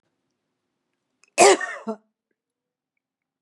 {"cough_length": "3.4 s", "cough_amplitude": 29077, "cough_signal_mean_std_ratio": 0.22, "survey_phase": "beta (2021-08-13 to 2022-03-07)", "age": "65+", "gender": "Female", "wearing_mask": "No", "symptom_none": true, "smoker_status": "Never smoked", "respiratory_condition_asthma": false, "respiratory_condition_other": false, "recruitment_source": "REACT", "submission_delay": "2 days", "covid_test_result": "Negative", "covid_test_method": "RT-qPCR", "influenza_a_test_result": "Negative", "influenza_b_test_result": "Negative"}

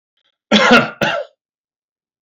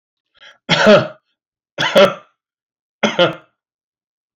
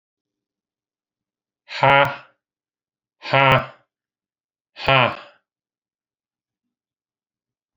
{"cough_length": "2.2 s", "cough_amplitude": 30686, "cough_signal_mean_std_ratio": 0.4, "three_cough_length": "4.4 s", "three_cough_amplitude": 30208, "three_cough_signal_mean_std_ratio": 0.36, "exhalation_length": "7.8 s", "exhalation_amplitude": 29737, "exhalation_signal_mean_std_ratio": 0.26, "survey_phase": "beta (2021-08-13 to 2022-03-07)", "age": "65+", "gender": "Male", "wearing_mask": "No", "symptom_none": true, "smoker_status": "Never smoked", "respiratory_condition_asthma": false, "respiratory_condition_other": false, "recruitment_source": "REACT", "submission_delay": "1 day", "covid_test_result": "Negative", "covid_test_method": "RT-qPCR"}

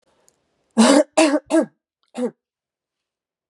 {"cough_length": "3.5 s", "cough_amplitude": 32767, "cough_signal_mean_std_ratio": 0.36, "survey_phase": "beta (2021-08-13 to 2022-03-07)", "age": "45-64", "gender": "Female", "wearing_mask": "No", "symptom_cough_any": true, "symptom_runny_or_blocked_nose": true, "symptom_fatigue": true, "symptom_change_to_sense_of_smell_or_taste": true, "symptom_onset": "3 days", "smoker_status": "Ex-smoker", "respiratory_condition_asthma": true, "respiratory_condition_other": false, "recruitment_source": "Test and Trace", "submission_delay": "2 days", "covid_test_result": "Positive", "covid_test_method": "RT-qPCR", "covid_ct_value": 12.9, "covid_ct_gene": "ORF1ab gene"}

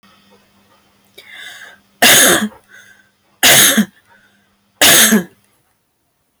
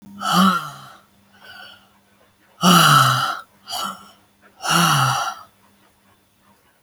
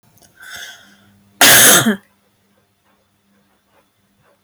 {"three_cough_length": "6.4 s", "three_cough_amplitude": 32768, "three_cough_signal_mean_std_ratio": 0.41, "exhalation_length": "6.8 s", "exhalation_amplitude": 29369, "exhalation_signal_mean_std_ratio": 0.46, "cough_length": "4.4 s", "cough_amplitude": 32768, "cough_signal_mean_std_ratio": 0.32, "survey_phase": "beta (2021-08-13 to 2022-03-07)", "age": "45-64", "gender": "Female", "wearing_mask": "No", "symptom_cough_any": true, "smoker_status": "Ex-smoker", "respiratory_condition_asthma": false, "respiratory_condition_other": false, "recruitment_source": "REACT", "submission_delay": "6 days", "covid_test_result": "Negative", "covid_test_method": "RT-qPCR"}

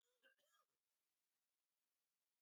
{"cough_length": "2.4 s", "cough_amplitude": 20, "cough_signal_mean_std_ratio": 0.42, "survey_phase": "beta (2021-08-13 to 2022-03-07)", "age": "65+", "gender": "Male", "wearing_mask": "No", "symptom_cough_any": true, "symptom_sore_throat": true, "smoker_status": "Never smoked", "respiratory_condition_asthma": false, "respiratory_condition_other": false, "recruitment_source": "Test and Trace", "submission_delay": "2 days", "covid_test_result": "Positive", "covid_test_method": "RT-qPCR", "covid_ct_value": 28.4, "covid_ct_gene": "ORF1ab gene", "covid_ct_mean": 28.9, "covid_viral_load": "330 copies/ml", "covid_viral_load_category": "Minimal viral load (< 10K copies/ml)"}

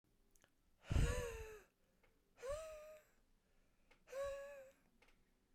{"exhalation_length": "5.5 s", "exhalation_amplitude": 1770, "exhalation_signal_mean_std_ratio": 0.39, "survey_phase": "beta (2021-08-13 to 2022-03-07)", "age": "45-64", "gender": "Male", "wearing_mask": "No", "symptom_none": true, "symptom_onset": "13 days", "smoker_status": "Ex-smoker", "respiratory_condition_asthma": true, "respiratory_condition_other": false, "recruitment_source": "REACT", "submission_delay": "2 days", "covid_test_result": "Negative", "covid_test_method": "RT-qPCR"}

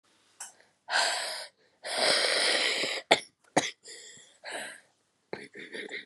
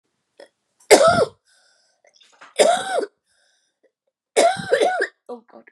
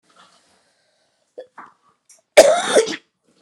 {"exhalation_length": "6.1 s", "exhalation_amplitude": 23813, "exhalation_signal_mean_std_ratio": 0.49, "three_cough_length": "5.7 s", "three_cough_amplitude": 32768, "three_cough_signal_mean_std_ratio": 0.38, "cough_length": "3.4 s", "cough_amplitude": 32768, "cough_signal_mean_std_ratio": 0.28, "survey_phase": "alpha (2021-03-01 to 2021-08-12)", "age": "18-44", "gender": "Female", "wearing_mask": "No", "symptom_cough_any": true, "symptom_new_continuous_cough": true, "symptom_shortness_of_breath": true, "symptom_diarrhoea": true, "symptom_fatigue": true, "symptom_fever_high_temperature": true, "symptom_headache": true, "symptom_onset": "3 days", "smoker_status": "Never smoked", "respiratory_condition_asthma": false, "respiratory_condition_other": true, "recruitment_source": "Test and Trace", "submission_delay": "2 days", "covid_test_result": "Positive", "covid_test_method": "RT-qPCR", "covid_ct_value": 17.1, "covid_ct_gene": "ORF1ab gene", "covid_ct_mean": 18.1, "covid_viral_load": "1200000 copies/ml", "covid_viral_load_category": "High viral load (>1M copies/ml)"}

